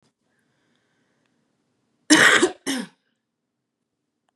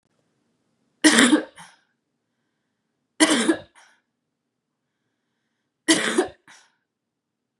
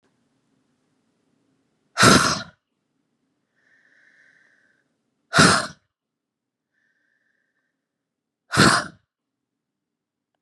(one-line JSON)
{"cough_length": "4.4 s", "cough_amplitude": 31210, "cough_signal_mean_std_ratio": 0.26, "three_cough_length": "7.6 s", "three_cough_amplitude": 32767, "three_cough_signal_mean_std_ratio": 0.29, "exhalation_length": "10.4 s", "exhalation_amplitude": 30196, "exhalation_signal_mean_std_ratio": 0.24, "survey_phase": "beta (2021-08-13 to 2022-03-07)", "age": "18-44", "gender": "Female", "wearing_mask": "No", "symptom_cough_any": true, "symptom_runny_or_blocked_nose": true, "symptom_change_to_sense_of_smell_or_taste": true, "symptom_onset": "12 days", "smoker_status": "Ex-smoker", "respiratory_condition_asthma": false, "respiratory_condition_other": false, "recruitment_source": "REACT", "submission_delay": "2 days", "covid_test_result": "Negative", "covid_test_method": "RT-qPCR", "influenza_a_test_result": "Negative", "influenza_b_test_result": "Negative"}